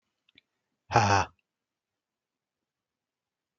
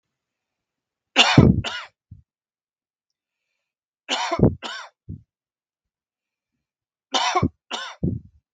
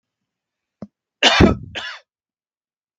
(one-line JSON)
{"exhalation_length": "3.6 s", "exhalation_amplitude": 16304, "exhalation_signal_mean_std_ratio": 0.22, "three_cough_length": "8.5 s", "three_cough_amplitude": 32768, "three_cough_signal_mean_std_ratio": 0.29, "cough_length": "3.0 s", "cough_amplitude": 32768, "cough_signal_mean_std_ratio": 0.28, "survey_phase": "beta (2021-08-13 to 2022-03-07)", "age": "45-64", "gender": "Male", "wearing_mask": "No", "symptom_none": true, "smoker_status": "Never smoked", "respiratory_condition_asthma": false, "respiratory_condition_other": false, "recruitment_source": "REACT", "submission_delay": "1 day", "covid_test_result": "Negative", "covid_test_method": "RT-qPCR"}